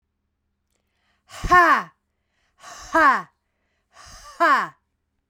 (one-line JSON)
{"exhalation_length": "5.3 s", "exhalation_amplitude": 22119, "exhalation_signal_mean_std_ratio": 0.35, "survey_phase": "beta (2021-08-13 to 2022-03-07)", "age": "45-64", "gender": "Female", "wearing_mask": "No", "symptom_new_continuous_cough": true, "symptom_runny_or_blocked_nose": true, "symptom_sore_throat": true, "symptom_fatigue": true, "symptom_fever_high_temperature": true, "symptom_headache": true, "symptom_change_to_sense_of_smell_or_taste": true, "symptom_loss_of_taste": true, "symptom_onset": "5 days", "smoker_status": "Ex-smoker", "respiratory_condition_asthma": false, "respiratory_condition_other": false, "recruitment_source": "Test and Trace", "submission_delay": "1 day", "covid_test_result": "Positive", "covid_test_method": "RT-qPCR", "covid_ct_value": 14.1, "covid_ct_gene": "ORF1ab gene", "covid_ct_mean": 14.5, "covid_viral_load": "18000000 copies/ml", "covid_viral_load_category": "High viral load (>1M copies/ml)"}